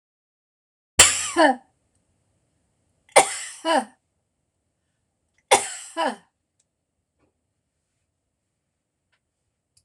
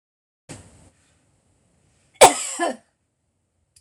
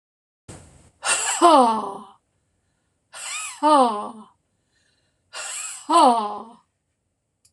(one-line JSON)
{"three_cough_length": "9.8 s", "three_cough_amplitude": 26028, "three_cough_signal_mean_std_ratio": 0.24, "cough_length": "3.8 s", "cough_amplitude": 26028, "cough_signal_mean_std_ratio": 0.2, "exhalation_length": "7.5 s", "exhalation_amplitude": 25842, "exhalation_signal_mean_std_ratio": 0.41, "survey_phase": "beta (2021-08-13 to 2022-03-07)", "age": "65+", "gender": "Female", "wearing_mask": "No", "symptom_none": true, "smoker_status": "Never smoked", "respiratory_condition_asthma": false, "respiratory_condition_other": false, "recruitment_source": "REACT", "submission_delay": "2 days", "covid_test_result": "Negative", "covid_test_method": "RT-qPCR", "influenza_a_test_result": "Negative", "influenza_b_test_result": "Negative"}